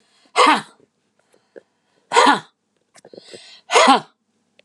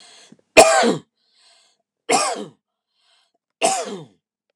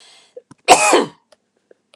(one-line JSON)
{"exhalation_length": "4.6 s", "exhalation_amplitude": 32195, "exhalation_signal_mean_std_ratio": 0.33, "three_cough_length": "4.6 s", "three_cough_amplitude": 32768, "three_cough_signal_mean_std_ratio": 0.33, "cough_length": "2.0 s", "cough_amplitude": 32768, "cough_signal_mean_std_ratio": 0.34, "survey_phase": "alpha (2021-03-01 to 2021-08-12)", "age": "45-64", "gender": "Male", "wearing_mask": "No", "symptom_none": true, "smoker_status": "Never smoked", "respiratory_condition_asthma": true, "respiratory_condition_other": false, "recruitment_source": "REACT", "submission_delay": "2 days", "covid_test_result": "Negative", "covid_test_method": "RT-qPCR"}